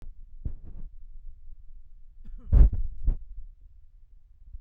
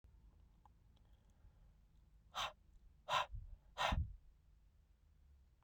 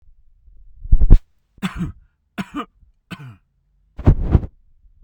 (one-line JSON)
{"cough_length": "4.6 s", "cough_amplitude": 17736, "cough_signal_mean_std_ratio": 0.4, "exhalation_length": "5.6 s", "exhalation_amplitude": 1844, "exhalation_signal_mean_std_ratio": 0.36, "three_cough_length": "5.0 s", "three_cough_amplitude": 32768, "three_cough_signal_mean_std_ratio": 0.3, "survey_phase": "beta (2021-08-13 to 2022-03-07)", "age": "45-64", "gender": "Male", "wearing_mask": "No", "symptom_none": true, "smoker_status": "Never smoked", "respiratory_condition_asthma": false, "respiratory_condition_other": false, "recruitment_source": "REACT", "submission_delay": "1 day", "covid_test_result": "Negative", "covid_test_method": "RT-qPCR"}